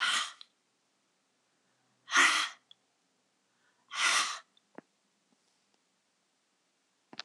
{"exhalation_length": "7.2 s", "exhalation_amplitude": 8848, "exhalation_signal_mean_std_ratio": 0.3, "survey_phase": "beta (2021-08-13 to 2022-03-07)", "age": "45-64", "gender": "Female", "wearing_mask": "No", "symptom_runny_or_blocked_nose": true, "symptom_onset": "3 days", "smoker_status": "Never smoked", "respiratory_condition_asthma": false, "respiratory_condition_other": false, "recruitment_source": "Test and Trace", "submission_delay": "2 days", "covid_test_result": "Positive", "covid_test_method": "ePCR"}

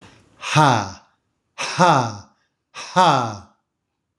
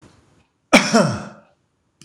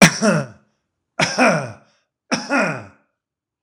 {"exhalation_length": "4.2 s", "exhalation_amplitude": 26027, "exhalation_signal_mean_std_ratio": 0.43, "cough_length": "2.0 s", "cough_amplitude": 26028, "cough_signal_mean_std_ratio": 0.34, "three_cough_length": "3.6 s", "three_cough_amplitude": 26028, "three_cough_signal_mean_std_ratio": 0.42, "survey_phase": "beta (2021-08-13 to 2022-03-07)", "age": "65+", "gender": "Male", "wearing_mask": "No", "symptom_none": true, "smoker_status": "Never smoked", "respiratory_condition_asthma": false, "respiratory_condition_other": false, "recruitment_source": "REACT", "submission_delay": "1 day", "covid_test_result": "Negative", "covid_test_method": "RT-qPCR", "influenza_a_test_result": "Negative", "influenza_b_test_result": "Negative"}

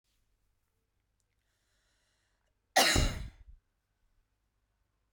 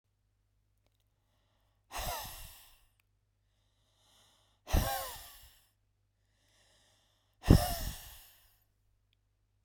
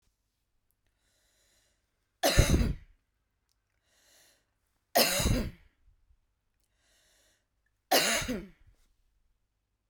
{"cough_length": "5.1 s", "cough_amplitude": 9974, "cough_signal_mean_std_ratio": 0.23, "exhalation_length": "9.6 s", "exhalation_amplitude": 15375, "exhalation_signal_mean_std_ratio": 0.22, "three_cough_length": "9.9 s", "three_cough_amplitude": 14812, "three_cough_signal_mean_std_ratio": 0.3, "survey_phase": "beta (2021-08-13 to 2022-03-07)", "age": "45-64", "gender": "Female", "wearing_mask": "No", "symptom_none": true, "smoker_status": "Never smoked", "respiratory_condition_asthma": false, "respiratory_condition_other": false, "recruitment_source": "REACT", "submission_delay": "1 day", "covid_test_result": "Negative", "covid_test_method": "RT-qPCR"}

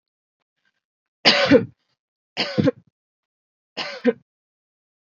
{"three_cough_length": "5.0 s", "three_cough_amplitude": 29174, "three_cough_signal_mean_std_ratio": 0.29, "survey_phase": "beta (2021-08-13 to 2022-03-07)", "age": "18-44", "gender": "Female", "wearing_mask": "No", "symptom_runny_or_blocked_nose": true, "symptom_fatigue": true, "symptom_onset": "6 days", "smoker_status": "Never smoked", "respiratory_condition_asthma": false, "respiratory_condition_other": false, "recruitment_source": "REACT", "submission_delay": "0 days", "covid_test_result": "Negative", "covid_test_method": "RT-qPCR", "influenza_a_test_result": "Negative", "influenza_b_test_result": "Negative"}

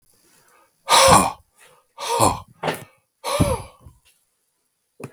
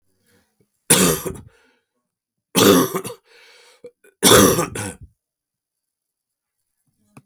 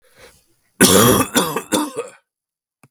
{"exhalation_length": "5.1 s", "exhalation_amplitude": 32768, "exhalation_signal_mean_std_ratio": 0.37, "three_cough_length": "7.3 s", "three_cough_amplitude": 32768, "three_cough_signal_mean_std_ratio": 0.33, "cough_length": "2.9 s", "cough_amplitude": 32768, "cough_signal_mean_std_ratio": 0.45, "survey_phase": "beta (2021-08-13 to 2022-03-07)", "age": "45-64", "gender": "Male", "wearing_mask": "No", "symptom_cough_any": true, "symptom_runny_or_blocked_nose": true, "symptom_sore_throat": true, "symptom_fatigue": true, "symptom_headache": true, "symptom_change_to_sense_of_smell_or_taste": true, "symptom_onset": "3 days", "smoker_status": "Never smoked", "respiratory_condition_asthma": false, "respiratory_condition_other": false, "recruitment_source": "Test and Trace", "submission_delay": "1 day", "covid_test_result": "Positive", "covid_test_method": "RT-qPCR", "covid_ct_value": 24.9, "covid_ct_gene": "N gene"}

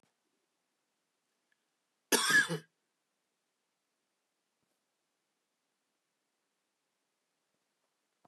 {"cough_length": "8.3 s", "cough_amplitude": 7310, "cough_signal_mean_std_ratio": 0.17, "survey_phase": "beta (2021-08-13 to 2022-03-07)", "age": "45-64", "gender": "Male", "wearing_mask": "No", "symptom_cough_any": true, "symptom_runny_or_blocked_nose": true, "symptom_sore_throat": true, "smoker_status": "Never smoked", "respiratory_condition_asthma": false, "respiratory_condition_other": false, "recruitment_source": "Test and Trace", "submission_delay": "0 days", "covid_test_result": "Positive", "covid_test_method": "LFT"}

